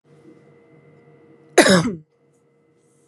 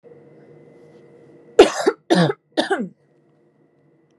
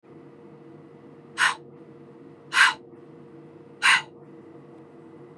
{"cough_length": "3.1 s", "cough_amplitude": 32767, "cough_signal_mean_std_ratio": 0.27, "three_cough_length": "4.2 s", "three_cough_amplitude": 32768, "three_cough_signal_mean_std_ratio": 0.29, "exhalation_length": "5.4 s", "exhalation_amplitude": 21326, "exhalation_signal_mean_std_ratio": 0.33, "survey_phase": "beta (2021-08-13 to 2022-03-07)", "age": "18-44", "gender": "Female", "wearing_mask": "No", "symptom_none": true, "smoker_status": "Never smoked", "respiratory_condition_asthma": false, "respiratory_condition_other": false, "recruitment_source": "REACT", "submission_delay": "1 day", "covid_test_result": "Negative", "covid_test_method": "RT-qPCR", "influenza_a_test_result": "Negative", "influenza_b_test_result": "Negative"}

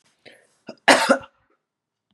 {"cough_length": "2.1 s", "cough_amplitude": 32392, "cough_signal_mean_std_ratio": 0.27, "survey_phase": "beta (2021-08-13 to 2022-03-07)", "age": "45-64", "gender": "Female", "wearing_mask": "No", "symptom_runny_or_blocked_nose": true, "symptom_sore_throat": true, "symptom_headache": true, "symptom_onset": "3 days", "smoker_status": "Current smoker (1 to 10 cigarettes per day)", "respiratory_condition_asthma": false, "respiratory_condition_other": false, "recruitment_source": "Test and Trace", "submission_delay": "2 days", "covid_test_result": "Positive", "covid_test_method": "RT-qPCR", "covid_ct_value": 16.8, "covid_ct_gene": "ORF1ab gene", "covid_ct_mean": 17.1, "covid_viral_load": "2400000 copies/ml", "covid_viral_load_category": "High viral load (>1M copies/ml)"}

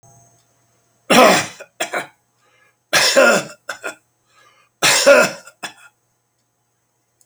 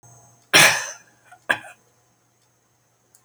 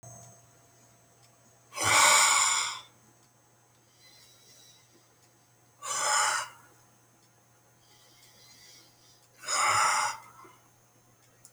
{"three_cough_length": "7.3 s", "three_cough_amplitude": 32768, "three_cough_signal_mean_std_ratio": 0.37, "cough_length": "3.2 s", "cough_amplitude": 32767, "cough_signal_mean_std_ratio": 0.26, "exhalation_length": "11.5 s", "exhalation_amplitude": 12913, "exhalation_signal_mean_std_ratio": 0.38, "survey_phase": "beta (2021-08-13 to 2022-03-07)", "age": "65+", "gender": "Male", "wearing_mask": "No", "symptom_none": true, "smoker_status": "Ex-smoker", "respiratory_condition_asthma": false, "respiratory_condition_other": false, "recruitment_source": "REACT", "submission_delay": "3 days", "covid_test_result": "Negative", "covid_test_method": "RT-qPCR"}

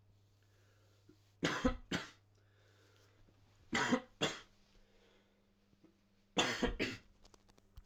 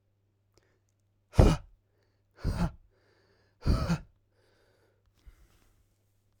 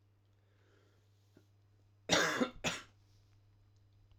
{"three_cough_length": "7.9 s", "three_cough_amplitude": 3803, "three_cough_signal_mean_std_ratio": 0.36, "exhalation_length": "6.4 s", "exhalation_amplitude": 17964, "exhalation_signal_mean_std_ratio": 0.25, "cough_length": "4.2 s", "cough_amplitude": 4768, "cough_signal_mean_std_ratio": 0.31, "survey_phase": "alpha (2021-03-01 to 2021-08-12)", "age": "18-44", "gender": "Male", "wearing_mask": "No", "symptom_cough_any": true, "smoker_status": "Never smoked", "respiratory_condition_asthma": false, "respiratory_condition_other": false, "recruitment_source": "Test and Trace", "submission_delay": "1 day", "covid_test_result": "Positive", "covid_test_method": "RT-qPCR"}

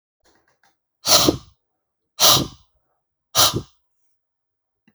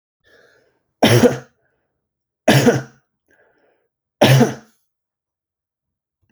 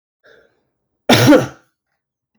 {"exhalation_length": "4.9 s", "exhalation_amplitude": 32768, "exhalation_signal_mean_std_ratio": 0.3, "three_cough_length": "6.3 s", "three_cough_amplitude": 32767, "three_cough_signal_mean_std_ratio": 0.31, "cough_length": "2.4 s", "cough_amplitude": 32767, "cough_signal_mean_std_ratio": 0.32, "survey_phase": "alpha (2021-03-01 to 2021-08-12)", "age": "45-64", "gender": "Male", "wearing_mask": "No", "symptom_none": true, "smoker_status": "Never smoked", "respiratory_condition_asthma": false, "respiratory_condition_other": false, "recruitment_source": "REACT", "submission_delay": "1 day", "covid_test_result": "Negative", "covid_test_method": "RT-qPCR"}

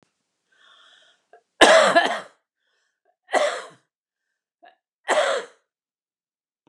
{"three_cough_length": "6.7 s", "three_cough_amplitude": 32767, "three_cough_signal_mean_std_ratio": 0.3, "survey_phase": "beta (2021-08-13 to 2022-03-07)", "age": "45-64", "gender": "Female", "wearing_mask": "No", "symptom_none": true, "smoker_status": "Never smoked", "respiratory_condition_asthma": true, "respiratory_condition_other": false, "recruitment_source": "REACT", "submission_delay": "1 day", "covid_test_result": "Negative", "covid_test_method": "RT-qPCR", "influenza_a_test_result": "Unknown/Void", "influenza_b_test_result": "Unknown/Void"}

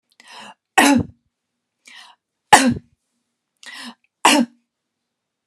{"three_cough_length": "5.5 s", "three_cough_amplitude": 32768, "three_cough_signal_mean_std_ratio": 0.29, "survey_phase": "beta (2021-08-13 to 2022-03-07)", "age": "45-64", "gender": "Female", "wearing_mask": "No", "symptom_none": true, "smoker_status": "Never smoked", "respiratory_condition_asthma": false, "respiratory_condition_other": false, "recruitment_source": "REACT", "submission_delay": "2 days", "covid_test_result": "Negative", "covid_test_method": "RT-qPCR"}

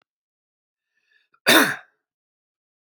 {"cough_length": "3.0 s", "cough_amplitude": 29809, "cough_signal_mean_std_ratio": 0.23, "survey_phase": "beta (2021-08-13 to 2022-03-07)", "age": "18-44", "gender": "Male", "wearing_mask": "No", "symptom_runny_or_blocked_nose": true, "symptom_shortness_of_breath": true, "symptom_sore_throat": true, "symptom_fatigue": true, "symptom_headache": true, "symptom_onset": "3 days", "smoker_status": "Never smoked", "respiratory_condition_asthma": false, "respiratory_condition_other": false, "recruitment_source": "Test and Trace", "submission_delay": "2 days", "covid_test_result": "Positive", "covid_test_method": "RT-qPCR", "covid_ct_value": 20.4, "covid_ct_gene": "ORF1ab gene"}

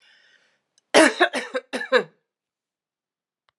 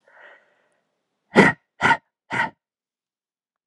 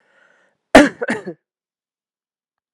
{"three_cough_length": "3.6 s", "three_cough_amplitude": 32156, "three_cough_signal_mean_std_ratio": 0.29, "exhalation_length": "3.7 s", "exhalation_amplitude": 32426, "exhalation_signal_mean_std_ratio": 0.26, "cough_length": "2.7 s", "cough_amplitude": 32768, "cough_signal_mean_std_ratio": 0.22, "survey_phase": "alpha (2021-03-01 to 2021-08-12)", "age": "18-44", "gender": "Female", "wearing_mask": "No", "symptom_cough_any": true, "symptom_fatigue": true, "symptom_headache": true, "symptom_change_to_sense_of_smell_or_taste": true, "symptom_loss_of_taste": true, "symptom_onset": "3 days", "smoker_status": "Ex-smoker", "respiratory_condition_asthma": false, "respiratory_condition_other": false, "recruitment_source": "Test and Trace", "submission_delay": "2 days", "covid_test_result": "Positive", "covid_test_method": "RT-qPCR", "covid_ct_value": 22.3, "covid_ct_gene": "ORF1ab gene"}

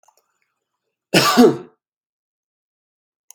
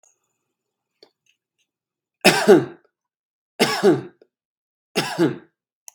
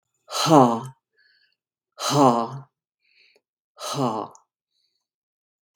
{"cough_length": "3.3 s", "cough_amplitude": 32768, "cough_signal_mean_std_ratio": 0.28, "three_cough_length": "5.9 s", "three_cough_amplitude": 32767, "three_cough_signal_mean_std_ratio": 0.3, "exhalation_length": "5.8 s", "exhalation_amplitude": 27332, "exhalation_signal_mean_std_ratio": 0.34, "survey_phase": "beta (2021-08-13 to 2022-03-07)", "age": "45-64", "gender": "Male", "wearing_mask": "No", "symptom_none": true, "smoker_status": "Never smoked", "respiratory_condition_asthma": false, "respiratory_condition_other": false, "recruitment_source": "REACT", "submission_delay": "1 day", "covid_test_result": "Negative", "covid_test_method": "RT-qPCR"}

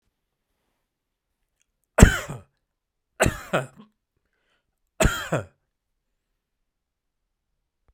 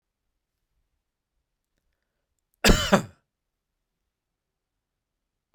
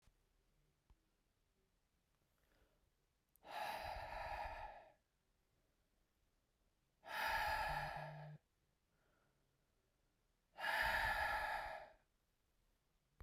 {"three_cough_length": "7.9 s", "three_cough_amplitude": 32768, "three_cough_signal_mean_std_ratio": 0.19, "cough_length": "5.5 s", "cough_amplitude": 23490, "cough_signal_mean_std_ratio": 0.17, "exhalation_length": "13.2 s", "exhalation_amplitude": 1325, "exhalation_signal_mean_std_ratio": 0.44, "survey_phase": "beta (2021-08-13 to 2022-03-07)", "age": "45-64", "gender": "Male", "wearing_mask": "Yes", "symptom_none": true, "smoker_status": "Never smoked", "respiratory_condition_asthma": false, "respiratory_condition_other": false, "recruitment_source": "Test and Trace", "submission_delay": "2 days", "covid_test_result": "Positive", "covid_test_method": "RT-qPCR", "covid_ct_value": 23.3, "covid_ct_gene": "ORF1ab gene", "covid_ct_mean": 24.0, "covid_viral_load": "13000 copies/ml", "covid_viral_load_category": "Low viral load (10K-1M copies/ml)"}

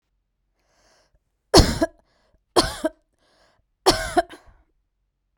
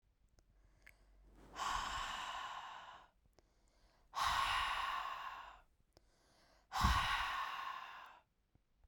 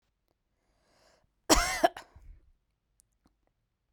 {"three_cough_length": "5.4 s", "three_cough_amplitude": 32768, "three_cough_signal_mean_std_ratio": 0.26, "exhalation_length": "8.9 s", "exhalation_amplitude": 3831, "exhalation_signal_mean_std_ratio": 0.54, "cough_length": "3.9 s", "cough_amplitude": 13744, "cough_signal_mean_std_ratio": 0.22, "survey_phase": "beta (2021-08-13 to 2022-03-07)", "age": "18-44", "gender": "Female", "wearing_mask": "No", "symptom_none": true, "smoker_status": "Never smoked", "respiratory_condition_asthma": false, "respiratory_condition_other": false, "recruitment_source": "REACT", "submission_delay": "1 day", "covid_test_result": "Negative", "covid_test_method": "RT-qPCR", "influenza_a_test_result": "Negative", "influenza_b_test_result": "Negative"}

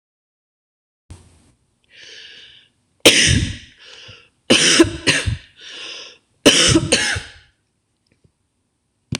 {"three_cough_length": "9.2 s", "three_cough_amplitude": 26028, "three_cough_signal_mean_std_ratio": 0.37, "survey_phase": "beta (2021-08-13 to 2022-03-07)", "age": "65+", "gender": "Female", "wearing_mask": "No", "symptom_runny_or_blocked_nose": true, "smoker_status": "Ex-smoker", "respiratory_condition_asthma": false, "respiratory_condition_other": false, "recruitment_source": "REACT", "submission_delay": "1 day", "covid_test_result": "Negative", "covid_test_method": "RT-qPCR", "influenza_a_test_result": "Negative", "influenza_b_test_result": "Negative"}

